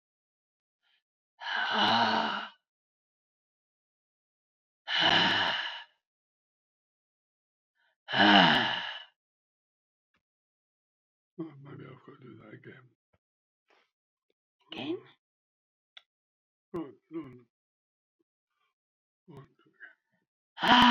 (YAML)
exhalation_length: 20.9 s
exhalation_amplitude: 15549
exhalation_signal_mean_std_ratio: 0.29
survey_phase: beta (2021-08-13 to 2022-03-07)
age: 65+
gender: Female
wearing_mask: 'No'
symptom_none: true
smoker_status: Ex-smoker
respiratory_condition_asthma: false
respiratory_condition_other: true
recruitment_source: REACT
submission_delay: 24 days
covid_test_result: Negative
covid_test_method: RT-qPCR